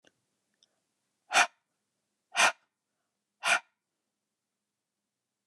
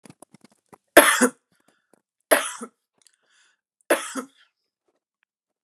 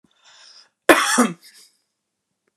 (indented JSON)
{
  "exhalation_length": "5.5 s",
  "exhalation_amplitude": 10406,
  "exhalation_signal_mean_std_ratio": 0.22,
  "three_cough_length": "5.6 s",
  "three_cough_amplitude": 32768,
  "three_cough_signal_mean_std_ratio": 0.23,
  "cough_length": "2.6 s",
  "cough_amplitude": 32768,
  "cough_signal_mean_std_ratio": 0.29,
  "survey_phase": "beta (2021-08-13 to 2022-03-07)",
  "age": "45-64",
  "gender": "Female",
  "wearing_mask": "No",
  "symptom_cough_any": true,
  "symptom_headache": true,
  "symptom_onset": "4 days",
  "smoker_status": "Never smoked",
  "respiratory_condition_asthma": false,
  "respiratory_condition_other": false,
  "recruitment_source": "REACT",
  "submission_delay": "1 day",
  "covid_test_result": "Positive",
  "covid_test_method": "RT-qPCR",
  "covid_ct_value": 28.0,
  "covid_ct_gene": "E gene",
  "influenza_a_test_result": "Negative",
  "influenza_b_test_result": "Negative"
}